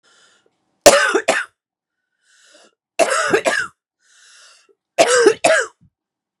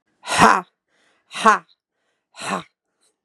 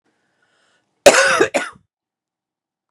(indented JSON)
{
  "three_cough_length": "6.4 s",
  "three_cough_amplitude": 32768,
  "three_cough_signal_mean_std_ratio": 0.39,
  "exhalation_length": "3.2 s",
  "exhalation_amplitude": 32767,
  "exhalation_signal_mean_std_ratio": 0.3,
  "cough_length": "2.9 s",
  "cough_amplitude": 32768,
  "cough_signal_mean_std_ratio": 0.3,
  "survey_phase": "beta (2021-08-13 to 2022-03-07)",
  "age": "45-64",
  "gender": "Female",
  "wearing_mask": "No",
  "symptom_cough_any": true,
  "symptom_runny_or_blocked_nose": true,
  "symptom_shortness_of_breath": true,
  "symptom_sore_throat": true,
  "symptom_diarrhoea": true,
  "symptom_fatigue": true,
  "symptom_fever_high_temperature": true,
  "symptom_headache": true,
  "symptom_change_to_sense_of_smell_or_taste": true,
  "symptom_loss_of_taste": true,
  "smoker_status": "Ex-smoker",
  "respiratory_condition_asthma": true,
  "respiratory_condition_other": false,
  "recruitment_source": "Test and Trace",
  "submission_delay": "0 days",
  "covid_test_result": "Positive",
  "covid_test_method": "LFT"
}